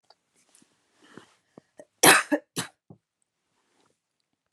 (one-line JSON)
{"cough_length": "4.5 s", "cough_amplitude": 32177, "cough_signal_mean_std_ratio": 0.19, "survey_phase": "beta (2021-08-13 to 2022-03-07)", "age": "18-44", "gender": "Female", "wearing_mask": "No", "symptom_cough_any": true, "symptom_runny_or_blocked_nose": true, "symptom_sore_throat": true, "symptom_other": true, "symptom_onset": "3 days", "smoker_status": "Ex-smoker", "respiratory_condition_asthma": false, "respiratory_condition_other": false, "recruitment_source": "Test and Trace", "submission_delay": "2 days", "covid_test_result": "Positive", "covid_test_method": "RT-qPCR", "covid_ct_value": 23.2, "covid_ct_gene": "N gene"}